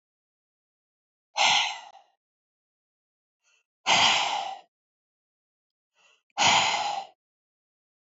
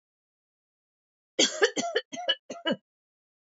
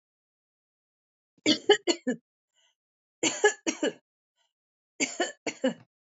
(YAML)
exhalation_length: 8.0 s
exhalation_amplitude: 13984
exhalation_signal_mean_std_ratio: 0.36
cough_length: 3.4 s
cough_amplitude: 13154
cough_signal_mean_std_ratio: 0.34
three_cough_length: 6.1 s
three_cough_amplitude: 13408
three_cough_signal_mean_std_ratio: 0.31
survey_phase: alpha (2021-03-01 to 2021-08-12)
age: 45-64
gender: Female
wearing_mask: 'No'
symptom_none: true
smoker_status: Never smoked
respiratory_condition_asthma: false
respiratory_condition_other: false
recruitment_source: REACT
submission_delay: 3 days
covid_test_result: Negative
covid_test_method: RT-qPCR